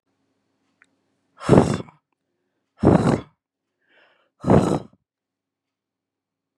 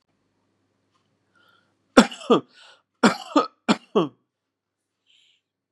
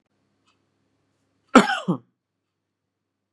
{"exhalation_length": "6.6 s", "exhalation_amplitude": 32767, "exhalation_signal_mean_std_ratio": 0.28, "three_cough_length": "5.7 s", "three_cough_amplitude": 32767, "three_cough_signal_mean_std_ratio": 0.24, "cough_length": "3.3 s", "cough_amplitude": 32767, "cough_signal_mean_std_ratio": 0.19, "survey_phase": "beta (2021-08-13 to 2022-03-07)", "age": "18-44", "gender": "Male", "wearing_mask": "No", "symptom_none": true, "smoker_status": "Never smoked", "respiratory_condition_asthma": false, "respiratory_condition_other": false, "recruitment_source": "REACT", "submission_delay": "3 days", "covid_test_result": "Negative", "covid_test_method": "RT-qPCR"}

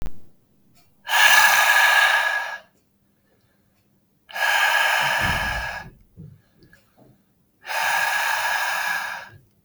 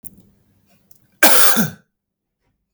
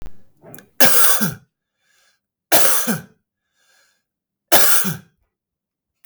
{"exhalation_length": "9.6 s", "exhalation_amplitude": 29552, "exhalation_signal_mean_std_ratio": 0.59, "cough_length": "2.7 s", "cough_amplitude": 32768, "cough_signal_mean_std_ratio": 0.34, "three_cough_length": "6.1 s", "three_cough_amplitude": 32768, "three_cough_signal_mean_std_ratio": 0.4, "survey_phase": "beta (2021-08-13 to 2022-03-07)", "age": "18-44", "gender": "Male", "wearing_mask": "No", "symptom_none": true, "smoker_status": "Ex-smoker", "respiratory_condition_asthma": false, "respiratory_condition_other": false, "recruitment_source": "Test and Trace", "submission_delay": "2 days", "covid_test_result": "Negative", "covid_test_method": "RT-qPCR"}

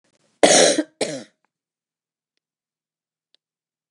{"cough_length": "3.9 s", "cough_amplitude": 27697, "cough_signal_mean_std_ratio": 0.27, "survey_phase": "beta (2021-08-13 to 2022-03-07)", "age": "65+", "gender": "Female", "wearing_mask": "No", "symptom_none": true, "symptom_onset": "12 days", "smoker_status": "Ex-smoker", "respiratory_condition_asthma": false, "respiratory_condition_other": false, "recruitment_source": "REACT", "submission_delay": "4 days", "covid_test_result": "Negative", "covid_test_method": "RT-qPCR", "influenza_a_test_result": "Negative", "influenza_b_test_result": "Negative"}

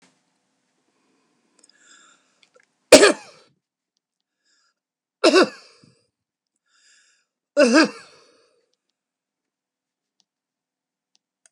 {"three_cough_length": "11.5 s", "three_cough_amplitude": 32768, "three_cough_signal_mean_std_ratio": 0.19, "survey_phase": "beta (2021-08-13 to 2022-03-07)", "age": "65+", "gender": "Male", "wearing_mask": "No", "symptom_none": true, "smoker_status": "Ex-smoker", "respiratory_condition_asthma": false, "respiratory_condition_other": false, "recruitment_source": "REACT", "submission_delay": "2 days", "covid_test_result": "Negative", "covid_test_method": "RT-qPCR", "influenza_a_test_result": "Negative", "influenza_b_test_result": "Negative"}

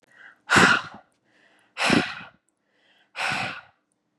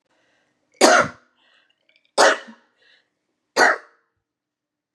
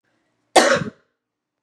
{"exhalation_length": "4.2 s", "exhalation_amplitude": 24094, "exhalation_signal_mean_std_ratio": 0.37, "three_cough_length": "4.9 s", "three_cough_amplitude": 32767, "three_cough_signal_mean_std_ratio": 0.29, "cough_length": "1.6 s", "cough_amplitude": 32767, "cough_signal_mean_std_ratio": 0.32, "survey_phase": "beta (2021-08-13 to 2022-03-07)", "age": "18-44", "gender": "Female", "wearing_mask": "No", "symptom_none": true, "smoker_status": "Current smoker (1 to 10 cigarettes per day)", "respiratory_condition_asthma": false, "respiratory_condition_other": false, "recruitment_source": "REACT", "submission_delay": "2 days", "covid_test_result": "Negative", "covid_test_method": "RT-qPCR", "influenza_a_test_result": "Negative", "influenza_b_test_result": "Negative"}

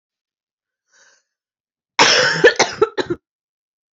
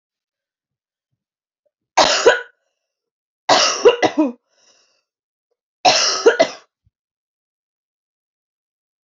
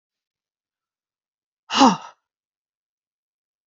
{"cough_length": "3.9 s", "cough_amplitude": 32768, "cough_signal_mean_std_ratio": 0.34, "three_cough_length": "9.0 s", "three_cough_amplitude": 32768, "three_cough_signal_mean_std_ratio": 0.32, "exhalation_length": "3.7 s", "exhalation_amplitude": 27884, "exhalation_signal_mean_std_ratio": 0.19, "survey_phase": "beta (2021-08-13 to 2022-03-07)", "age": "18-44", "gender": "Female", "wearing_mask": "No", "symptom_cough_any": true, "symptom_new_continuous_cough": true, "symptom_runny_or_blocked_nose": true, "symptom_headache": true, "symptom_onset": "4 days", "smoker_status": "Never smoked", "respiratory_condition_asthma": false, "respiratory_condition_other": false, "recruitment_source": "Test and Trace", "submission_delay": "2 days", "covid_test_result": "Positive", "covid_test_method": "RT-qPCR", "covid_ct_value": 29.4, "covid_ct_gene": "ORF1ab gene", "covid_ct_mean": 29.7, "covid_viral_load": "180 copies/ml", "covid_viral_load_category": "Minimal viral load (< 10K copies/ml)"}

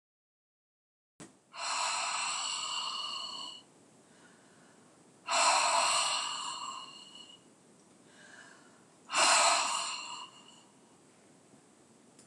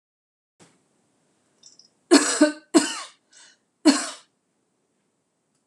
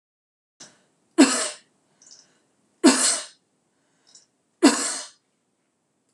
{"exhalation_length": "12.3 s", "exhalation_amplitude": 7359, "exhalation_signal_mean_std_ratio": 0.49, "cough_length": "5.7 s", "cough_amplitude": 25364, "cough_signal_mean_std_ratio": 0.27, "three_cough_length": "6.1 s", "three_cough_amplitude": 24848, "three_cough_signal_mean_std_ratio": 0.29, "survey_phase": "beta (2021-08-13 to 2022-03-07)", "age": "65+", "gender": "Female", "wearing_mask": "No", "symptom_none": true, "smoker_status": "Never smoked", "respiratory_condition_asthma": false, "respiratory_condition_other": false, "recruitment_source": "REACT", "submission_delay": "1 day", "covid_test_result": "Negative", "covid_test_method": "RT-qPCR"}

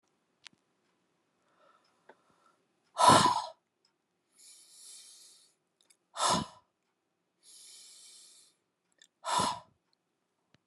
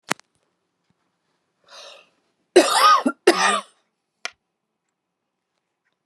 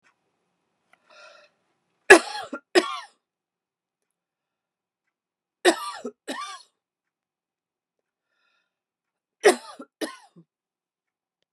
{"exhalation_length": "10.7 s", "exhalation_amplitude": 12633, "exhalation_signal_mean_std_ratio": 0.24, "cough_length": "6.1 s", "cough_amplitude": 32767, "cough_signal_mean_std_ratio": 0.29, "three_cough_length": "11.5 s", "three_cough_amplitude": 32768, "three_cough_signal_mean_std_ratio": 0.17, "survey_phase": "beta (2021-08-13 to 2022-03-07)", "age": "45-64", "gender": "Female", "wearing_mask": "No", "symptom_none": true, "smoker_status": "Ex-smoker", "respiratory_condition_asthma": false, "respiratory_condition_other": false, "recruitment_source": "REACT", "submission_delay": "2 days", "covid_test_result": "Negative", "covid_test_method": "RT-qPCR"}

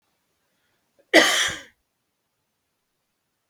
{"cough_length": "3.5 s", "cough_amplitude": 32232, "cough_signal_mean_std_ratio": 0.24, "survey_phase": "beta (2021-08-13 to 2022-03-07)", "age": "45-64", "gender": "Male", "wearing_mask": "No", "symptom_change_to_sense_of_smell_or_taste": true, "symptom_loss_of_taste": true, "smoker_status": "Never smoked", "respiratory_condition_asthma": false, "respiratory_condition_other": false, "recruitment_source": "Test and Trace", "submission_delay": "2 days", "covid_test_result": "Positive", "covid_test_method": "RT-qPCR", "covid_ct_value": 16.5, "covid_ct_gene": "ORF1ab gene"}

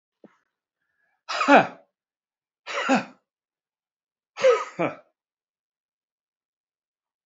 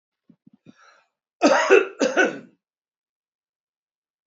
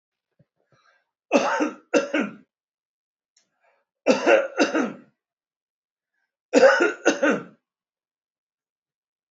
{"exhalation_length": "7.3 s", "exhalation_amplitude": 26759, "exhalation_signal_mean_std_ratio": 0.26, "cough_length": "4.3 s", "cough_amplitude": 26637, "cough_signal_mean_std_ratio": 0.32, "three_cough_length": "9.3 s", "three_cough_amplitude": 25630, "three_cough_signal_mean_std_ratio": 0.36, "survey_phase": "beta (2021-08-13 to 2022-03-07)", "age": "65+", "gender": "Male", "wearing_mask": "No", "symptom_none": true, "symptom_onset": "5 days", "smoker_status": "Never smoked", "respiratory_condition_asthma": false, "respiratory_condition_other": false, "recruitment_source": "REACT", "submission_delay": "11 days", "covid_test_result": "Negative", "covid_test_method": "RT-qPCR"}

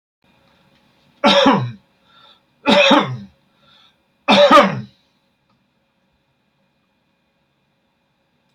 {"three_cough_length": "8.5 s", "three_cough_amplitude": 31339, "three_cough_signal_mean_std_ratio": 0.33, "survey_phase": "beta (2021-08-13 to 2022-03-07)", "age": "65+", "gender": "Male", "wearing_mask": "No", "symptom_none": true, "smoker_status": "Ex-smoker", "respiratory_condition_asthma": false, "respiratory_condition_other": false, "recruitment_source": "REACT", "submission_delay": "9 days", "covid_test_result": "Negative", "covid_test_method": "RT-qPCR", "influenza_a_test_result": "Negative", "influenza_b_test_result": "Negative"}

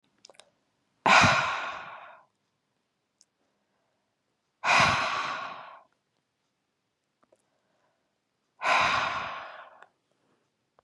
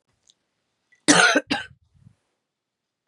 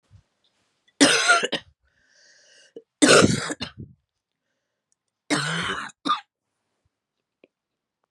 {"exhalation_length": "10.8 s", "exhalation_amplitude": 22650, "exhalation_signal_mean_std_ratio": 0.34, "cough_length": "3.1 s", "cough_amplitude": 29183, "cough_signal_mean_std_ratio": 0.28, "three_cough_length": "8.1 s", "three_cough_amplitude": 27592, "three_cough_signal_mean_std_ratio": 0.32, "survey_phase": "beta (2021-08-13 to 2022-03-07)", "age": "45-64", "gender": "Female", "wearing_mask": "No", "symptom_cough_any": true, "symptom_runny_or_blocked_nose": true, "symptom_sore_throat": true, "symptom_abdominal_pain": true, "symptom_fatigue": true, "smoker_status": "Ex-smoker", "respiratory_condition_asthma": false, "respiratory_condition_other": false, "recruitment_source": "Test and Trace", "submission_delay": "2 days", "covid_test_result": "Positive", "covid_test_method": "LFT"}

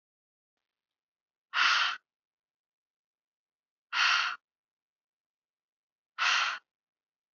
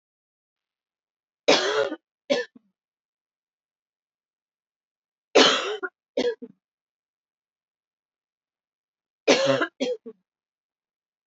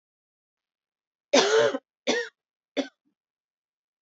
{"exhalation_length": "7.3 s", "exhalation_amplitude": 8937, "exhalation_signal_mean_std_ratio": 0.32, "three_cough_length": "11.3 s", "three_cough_amplitude": 23753, "three_cough_signal_mean_std_ratio": 0.28, "cough_length": "4.0 s", "cough_amplitude": 18009, "cough_signal_mean_std_ratio": 0.32, "survey_phase": "beta (2021-08-13 to 2022-03-07)", "age": "18-44", "gender": "Female", "wearing_mask": "No", "symptom_sore_throat": true, "smoker_status": "Never smoked", "respiratory_condition_asthma": false, "respiratory_condition_other": false, "recruitment_source": "REACT", "submission_delay": "2 days", "covid_test_result": "Negative", "covid_test_method": "RT-qPCR"}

